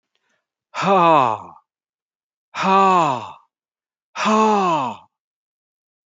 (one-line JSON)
{"exhalation_length": "6.1 s", "exhalation_amplitude": 25484, "exhalation_signal_mean_std_ratio": 0.47, "survey_phase": "alpha (2021-03-01 to 2021-08-12)", "age": "45-64", "gender": "Male", "wearing_mask": "No", "symptom_none": true, "smoker_status": "Never smoked", "respiratory_condition_asthma": false, "respiratory_condition_other": false, "recruitment_source": "REACT", "submission_delay": "1 day", "covid_test_result": "Negative", "covid_test_method": "RT-qPCR"}